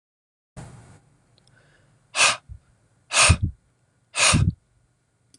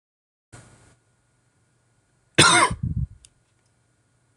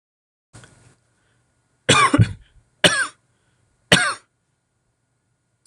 {"exhalation_length": "5.4 s", "exhalation_amplitude": 22661, "exhalation_signal_mean_std_ratio": 0.33, "cough_length": "4.4 s", "cough_amplitude": 26607, "cough_signal_mean_std_ratio": 0.27, "three_cough_length": "5.7 s", "three_cough_amplitude": 26606, "three_cough_signal_mean_std_ratio": 0.29, "survey_phase": "beta (2021-08-13 to 2022-03-07)", "age": "18-44", "gender": "Male", "wearing_mask": "No", "symptom_runny_or_blocked_nose": true, "smoker_status": "Never smoked", "respiratory_condition_asthma": false, "respiratory_condition_other": false, "recruitment_source": "Test and Trace", "submission_delay": "2 days", "covid_test_result": "Positive", "covid_test_method": "RT-qPCR", "covid_ct_value": 33.4, "covid_ct_gene": "N gene"}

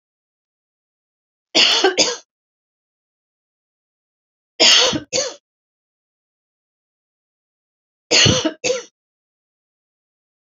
{"three_cough_length": "10.5 s", "three_cough_amplitude": 32768, "three_cough_signal_mean_std_ratio": 0.3, "survey_phase": "beta (2021-08-13 to 2022-03-07)", "age": "45-64", "gender": "Female", "wearing_mask": "No", "symptom_none": true, "smoker_status": "Never smoked", "respiratory_condition_asthma": false, "respiratory_condition_other": false, "recruitment_source": "REACT", "submission_delay": "0 days", "covid_test_result": "Negative", "covid_test_method": "RT-qPCR", "influenza_a_test_result": "Negative", "influenza_b_test_result": "Negative"}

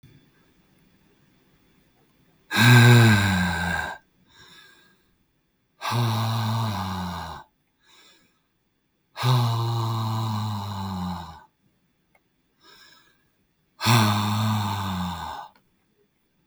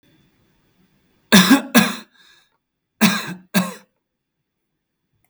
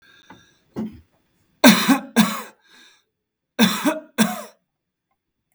{"exhalation_length": "16.5 s", "exhalation_amplitude": 23268, "exhalation_signal_mean_std_ratio": 0.47, "cough_length": "5.3 s", "cough_amplitude": 32768, "cough_signal_mean_std_ratio": 0.3, "three_cough_length": "5.5 s", "three_cough_amplitude": 32768, "three_cough_signal_mean_std_ratio": 0.33, "survey_phase": "beta (2021-08-13 to 2022-03-07)", "age": "45-64", "gender": "Male", "wearing_mask": "No", "symptom_none": true, "smoker_status": "Never smoked", "respiratory_condition_asthma": false, "respiratory_condition_other": false, "recruitment_source": "REACT", "submission_delay": "2 days", "covid_test_result": "Negative", "covid_test_method": "RT-qPCR", "influenza_a_test_result": "Negative", "influenza_b_test_result": "Negative"}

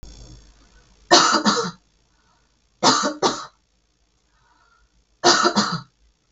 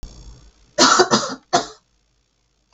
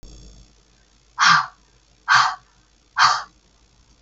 {"three_cough_length": "6.3 s", "three_cough_amplitude": 32768, "three_cough_signal_mean_std_ratio": 0.39, "cough_length": "2.7 s", "cough_amplitude": 32768, "cough_signal_mean_std_ratio": 0.37, "exhalation_length": "4.0 s", "exhalation_amplitude": 28494, "exhalation_signal_mean_std_ratio": 0.36, "survey_phase": "beta (2021-08-13 to 2022-03-07)", "age": "45-64", "gender": "Female", "wearing_mask": "No", "symptom_abdominal_pain": true, "symptom_onset": "7 days", "smoker_status": "Ex-smoker", "respiratory_condition_asthma": false, "respiratory_condition_other": false, "recruitment_source": "REACT", "submission_delay": "1 day", "covid_test_result": "Negative", "covid_test_method": "RT-qPCR", "influenza_a_test_result": "Negative", "influenza_b_test_result": "Negative"}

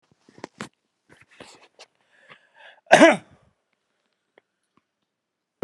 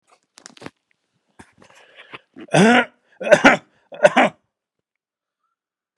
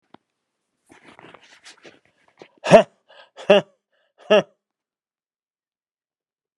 {"cough_length": "5.6 s", "cough_amplitude": 32768, "cough_signal_mean_std_ratio": 0.17, "three_cough_length": "6.0 s", "three_cough_amplitude": 32768, "three_cough_signal_mean_std_ratio": 0.29, "exhalation_length": "6.6 s", "exhalation_amplitude": 32768, "exhalation_signal_mean_std_ratio": 0.19, "survey_phase": "beta (2021-08-13 to 2022-03-07)", "age": "65+", "gender": "Male", "wearing_mask": "No", "symptom_none": true, "smoker_status": "Never smoked", "respiratory_condition_asthma": false, "respiratory_condition_other": false, "recruitment_source": "REACT", "submission_delay": "2 days", "covid_test_result": "Negative", "covid_test_method": "RT-qPCR", "influenza_a_test_result": "Negative", "influenza_b_test_result": "Negative"}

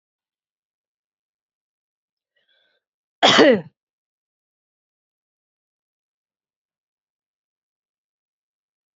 {"cough_length": "9.0 s", "cough_amplitude": 28767, "cough_signal_mean_std_ratio": 0.16, "survey_phase": "beta (2021-08-13 to 2022-03-07)", "age": "45-64", "gender": "Female", "wearing_mask": "No", "symptom_cough_any": true, "symptom_new_continuous_cough": true, "symptom_runny_or_blocked_nose": true, "symptom_shortness_of_breath": true, "symptom_abdominal_pain": true, "symptom_fatigue": true, "symptom_fever_high_temperature": true, "symptom_headache": true, "symptom_change_to_sense_of_smell_or_taste": true, "symptom_onset": "5 days", "smoker_status": "Never smoked", "respiratory_condition_asthma": false, "respiratory_condition_other": false, "recruitment_source": "Test and Trace", "submission_delay": "1 day", "covid_test_result": "Positive", "covid_test_method": "RT-qPCR"}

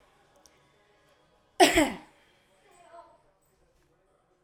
{"cough_length": "4.4 s", "cough_amplitude": 19937, "cough_signal_mean_std_ratio": 0.21, "survey_phase": "alpha (2021-03-01 to 2021-08-12)", "age": "18-44", "gender": "Female", "wearing_mask": "No", "symptom_none": true, "smoker_status": "Prefer not to say", "respiratory_condition_asthma": false, "respiratory_condition_other": false, "recruitment_source": "REACT", "submission_delay": "1 day", "covid_test_result": "Negative", "covid_test_method": "RT-qPCR"}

